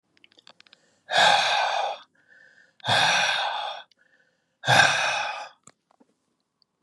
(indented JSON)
{
  "exhalation_length": "6.8 s",
  "exhalation_amplitude": 25010,
  "exhalation_signal_mean_std_ratio": 0.48,
  "survey_phase": "beta (2021-08-13 to 2022-03-07)",
  "age": "65+",
  "gender": "Male",
  "wearing_mask": "No",
  "symptom_none": true,
  "smoker_status": "Never smoked",
  "respiratory_condition_asthma": false,
  "respiratory_condition_other": false,
  "recruitment_source": "REACT",
  "submission_delay": "2 days",
  "covid_test_result": "Negative",
  "covid_test_method": "RT-qPCR",
  "influenza_a_test_result": "Negative",
  "influenza_b_test_result": "Negative"
}